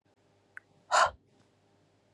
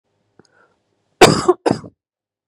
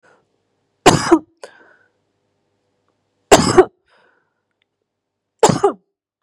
{"exhalation_length": "2.1 s", "exhalation_amplitude": 7935, "exhalation_signal_mean_std_ratio": 0.25, "cough_length": "2.5 s", "cough_amplitude": 32768, "cough_signal_mean_std_ratio": 0.27, "three_cough_length": "6.2 s", "three_cough_amplitude": 32768, "three_cough_signal_mean_std_ratio": 0.26, "survey_phase": "beta (2021-08-13 to 2022-03-07)", "age": "18-44", "gender": "Female", "wearing_mask": "No", "symptom_cough_any": true, "symptom_runny_or_blocked_nose": true, "symptom_abdominal_pain": true, "smoker_status": "Never smoked", "respiratory_condition_asthma": false, "respiratory_condition_other": false, "recruitment_source": "REACT", "submission_delay": "1 day", "covid_test_result": "Negative", "covid_test_method": "RT-qPCR", "influenza_a_test_result": "Negative", "influenza_b_test_result": "Negative"}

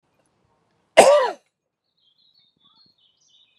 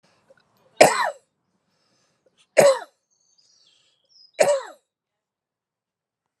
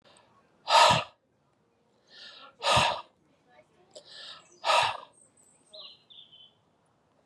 {"cough_length": "3.6 s", "cough_amplitude": 32768, "cough_signal_mean_std_ratio": 0.23, "three_cough_length": "6.4 s", "three_cough_amplitude": 32768, "three_cough_signal_mean_std_ratio": 0.24, "exhalation_length": "7.3 s", "exhalation_amplitude": 14422, "exhalation_signal_mean_std_ratio": 0.31, "survey_phase": "alpha (2021-03-01 to 2021-08-12)", "age": "45-64", "gender": "Male", "wearing_mask": "No", "symptom_cough_any": true, "symptom_abdominal_pain": true, "symptom_fatigue": true, "symptom_headache": true, "symptom_change_to_sense_of_smell_or_taste": true, "symptom_loss_of_taste": true, "symptom_onset": "3 days", "smoker_status": "Never smoked", "respiratory_condition_asthma": false, "respiratory_condition_other": false, "recruitment_source": "Test and Trace", "submission_delay": "2 days", "covid_test_result": "Positive", "covid_test_method": "RT-qPCR", "covid_ct_value": 12.4, "covid_ct_gene": "ORF1ab gene", "covid_ct_mean": 13.1, "covid_viral_load": "49000000 copies/ml", "covid_viral_load_category": "High viral load (>1M copies/ml)"}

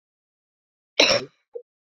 {"cough_length": "1.9 s", "cough_amplitude": 31267, "cough_signal_mean_std_ratio": 0.27, "survey_phase": "beta (2021-08-13 to 2022-03-07)", "age": "18-44", "gender": "Female", "wearing_mask": "No", "symptom_cough_any": true, "symptom_runny_or_blocked_nose": true, "symptom_fatigue": true, "symptom_headache": true, "symptom_loss_of_taste": true, "symptom_onset": "4 days", "smoker_status": "Ex-smoker", "respiratory_condition_asthma": false, "respiratory_condition_other": false, "recruitment_source": "Test and Trace", "submission_delay": "2 days", "covid_test_result": "Positive", "covid_test_method": "RT-qPCR", "covid_ct_value": 19.4, "covid_ct_gene": "ORF1ab gene"}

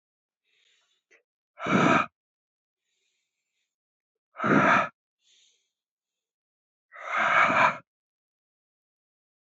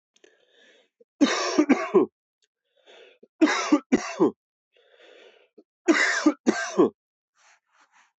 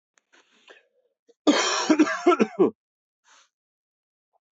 {"exhalation_length": "9.6 s", "exhalation_amplitude": 15571, "exhalation_signal_mean_std_ratio": 0.32, "three_cough_length": "8.2 s", "three_cough_amplitude": 15463, "three_cough_signal_mean_std_ratio": 0.39, "cough_length": "4.5 s", "cough_amplitude": 16155, "cough_signal_mean_std_ratio": 0.35, "survey_phase": "beta (2021-08-13 to 2022-03-07)", "age": "45-64", "gender": "Male", "wearing_mask": "No", "symptom_headache": true, "symptom_change_to_sense_of_smell_or_taste": true, "symptom_loss_of_taste": true, "symptom_onset": "7 days", "smoker_status": "Never smoked", "respiratory_condition_asthma": false, "respiratory_condition_other": false, "recruitment_source": "Test and Trace", "submission_delay": "3 days", "covid_test_result": "Positive", "covid_test_method": "RT-qPCR", "covid_ct_value": 16.0, "covid_ct_gene": "ORF1ab gene"}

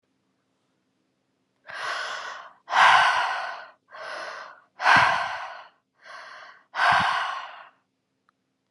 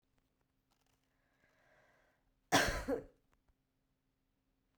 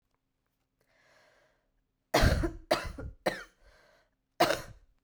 {"exhalation_length": "8.7 s", "exhalation_amplitude": 20083, "exhalation_signal_mean_std_ratio": 0.43, "cough_length": "4.8 s", "cough_amplitude": 4402, "cough_signal_mean_std_ratio": 0.23, "three_cough_length": "5.0 s", "three_cough_amplitude": 9180, "three_cough_signal_mean_std_ratio": 0.33, "survey_phase": "beta (2021-08-13 to 2022-03-07)", "age": "18-44", "gender": "Female", "wearing_mask": "No", "symptom_cough_any": true, "symptom_runny_or_blocked_nose": true, "symptom_diarrhoea": true, "symptom_fatigue": true, "symptom_headache": true, "symptom_change_to_sense_of_smell_or_taste": true, "symptom_onset": "8 days", "smoker_status": "Never smoked", "respiratory_condition_asthma": true, "respiratory_condition_other": false, "recruitment_source": "Test and Trace", "submission_delay": "2 days", "covid_test_result": "Positive", "covid_test_method": "RT-qPCR"}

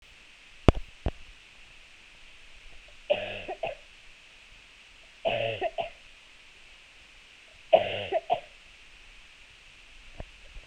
{"three_cough_length": "10.7 s", "three_cough_amplitude": 32767, "three_cough_signal_mean_std_ratio": 0.32, "survey_phase": "beta (2021-08-13 to 2022-03-07)", "age": "18-44", "gender": "Female", "wearing_mask": "No", "symptom_cough_any": true, "symptom_runny_or_blocked_nose": true, "symptom_fatigue": true, "symptom_headache": true, "symptom_change_to_sense_of_smell_or_taste": true, "symptom_onset": "12 days", "smoker_status": "Never smoked", "respiratory_condition_asthma": false, "respiratory_condition_other": false, "recruitment_source": "Test and Trace", "submission_delay": "1 day", "covid_test_result": "Positive", "covid_test_method": "RT-qPCR"}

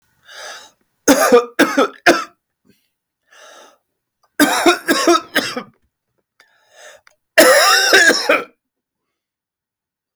{"three_cough_length": "10.2 s", "three_cough_amplitude": 32768, "three_cough_signal_mean_std_ratio": 0.42, "survey_phase": "alpha (2021-03-01 to 2021-08-12)", "age": "45-64", "gender": "Male", "wearing_mask": "No", "symptom_none": true, "symptom_onset": "12 days", "smoker_status": "Ex-smoker", "respiratory_condition_asthma": false, "respiratory_condition_other": false, "recruitment_source": "REACT", "submission_delay": "1 day", "covid_test_result": "Negative", "covid_test_method": "RT-qPCR"}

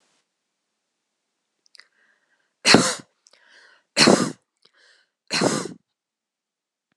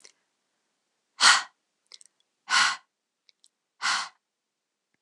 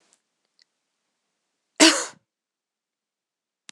{"three_cough_length": "7.0 s", "three_cough_amplitude": 26028, "three_cough_signal_mean_std_ratio": 0.26, "exhalation_length": "5.0 s", "exhalation_amplitude": 20090, "exhalation_signal_mean_std_ratio": 0.27, "cough_length": "3.7 s", "cough_amplitude": 26028, "cough_signal_mean_std_ratio": 0.18, "survey_phase": "beta (2021-08-13 to 2022-03-07)", "age": "45-64", "gender": "Female", "wearing_mask": "No", "symptom_cough_any": true, "symptom_runny_or_blocked_nose": true, "symptom_sore_throat": true, "symptom_fatigue": true, "symptom_headache": true, "symptom_other": true, "symptom_onset": "2 days", "smoker_status": "Never smoked", "respiratory_condition_asthma": false, "respiratory_condition_other": false, "recruitment_source": "Test and Trace", "submission_delay": "1 day", "covid_test_result": "Positive", "covid_test_method": "RT-qPCR", "covid_ct_value": 19.1, "covid_ct_gene": "ORF1ab gene", "covid_ct_mean": 19.6, "covid_viral_load": "380000 copies/ml", "covid_viral_load_category": "Low viral load (10K-1M copies/ml)"}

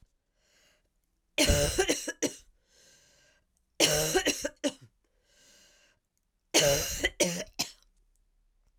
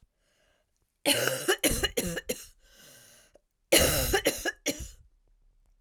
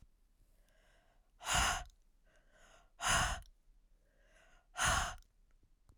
{"three_cough_length": "8.8 s", "three_cough_amplitude": 12853, "three_cough_signal_mean_std_ratio": 0.4, "cough_length": "5.8 s", "cough_amplitude": 17448, "cough_signal_mean_std_ratio": 0.44, "exhalation_length": "6.0 s", "exhalation_amplitude": 4112, "exhalation_signal_mean_std_ratio": 0.38, "survey_phase": "alpha (2021-03-01 to 2021-08-12)", "age": "18-44", "gender": "Female", "wearing_mask": "No", "symptom_cough_any": true, "symptom_shortness_of_breath": true, "symptom_fatigue": true, "symptom_fever_high_temperature": true, "symptom_headache": true, "symptom_onset": "6 days", "smoker_status": "Never smoked", "respiratory_condition_asthma": false, "respiratory_condition_other": false, "recruitment_source": "Test and Trace", "submission_delay": "1 day", "covid_test_result": "Positive", "covid_test_method": "RT-qPCR"}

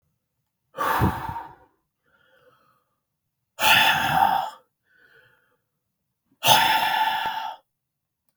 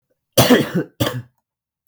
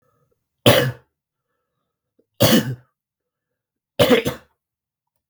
{"exhalation_length": "8.4 s", "exhalation_amplitude": 31942, "exhalation_signal_mean_std_ratio": 0.43, "cough_length": "1.9 s", "cough_amplitude": 32768, "cough_signal_mean_std_ratio": 0.41, "three_cough_length": "5.3 s", "three_cough_amplitude": 32766, "three_cough_signal_mean_std_ratio": 0.31, "survey_phase": "beta (2021-08-13 to 2022-03-07)", "age": "18-44", "gender": "Male", "wearing_mask": "No", "symptom_cough_any": true, "symptom_runny_or_blocked_nose": true, "smoker_status": "Never smoked", "respiratory_condition_asthma": false, "respiratory_condition_other": false, "recruitment_source": "REACT", "submission_delay": "1 day", "covid_test_result": "Negative", "covid_test_method": "RT-qPCR", "influenza_a_test_result": "Negative", "influenza_b_test_result": "Negative"}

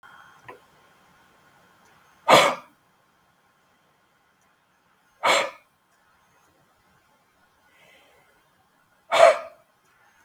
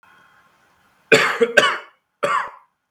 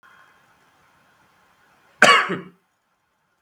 {"exhalation_length": "10.2 s", "exhalation_amplitude": 32766, "exhalation_signal_mean_std_ratio": 0.22, "three_cough_length": "2.9 s", "three_cough_amplitude": 32768, "three_cough_signal_mean_std_ratio": 0.4, "cough_length": "3.4 s", "cough_amplitude": 32768, "cough_signal_mean_std_ratio": 0.23, "survey_phase": "beta (2021-08-13 to 2022-03-07)", "age": "18-44", "gender": "Male", "wearing_mask": "No", "symptom_cough_any": true, "symptom_runny_or_blocked_nose": true, "smoker_status": "Never smoked", "respiratory_condition_asthma": false, "respiratory_condition_other": false, "recruitment_source": "Test and Trace", "submission_delay": "1 day", "covid_test_result": "Positive", "covid_test_method": "RT-qPCR"}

